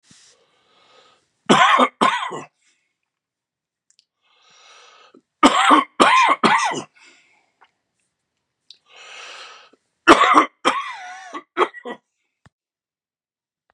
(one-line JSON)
{"three_cough_length": "13.7 s", "three_cough_amplitude": 32768, "three_cough_signal_mean_std_ratio": 0.34, "survey_phase": "beta (2021-08-13 to 2022-03-07)", "age": "65+", "gender": "Male", "wearing_mask": "No", "symptom_cough_any": true, "symptom_runny_or_blocked_nose": true, "symptom_sore_throat": true, "symptom_other": true, "symptom_onset": "3 days", "smoker_status": "Never smoked", "respiratory_condition_asthma": false, "respiratory_condition_other": false, "recruitment_source": "Test and Trace", "submission_delay": "2 days", "covid_test_result": "Positive", "covid_test_method": "RT-qPCR", "covid_ct_value": 19.8, "covid_ct_gene": "ORF1ab gene", "covid_ct_mean": 20.2, "covid_viral_load": "240000 copies/ml", "covid_viral_load_category": "Low viral load (10K-1M copies/ml)"}